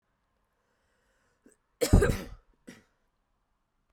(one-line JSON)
{"cough_length": "3.9 s", "cough_amplitude": 17095, "cough_signal_mean_std_ratio": 0.21, "survey_phase": "beta (2021-08-13 to 2022-03-07)", "age": "18-44", "gender": "Female", "wearing_mask": "No", "symptom_cough_any": true, "symptom_runny_or_blocked_nose": true, "symptom_sore_throat": true, "symptom_fever_high_temperature": true, "symptom_headache": true, "symptom_change_to_sense_of_smell_or_taste": true, "symptom_loss_of_taste": true, "smoker_status": "Ex-smoker", "respiratory_condition_asthma": false, "respiratory_condition_other": false, "recruitment_source": "Test and Trace", "submission_delay": "3 days", "covid_test_result": "Positive", "covid_test_method": "RT-qPCR", "covid_ct_value": 22.3, "covid_ct_gene": "ORF1ab gene"}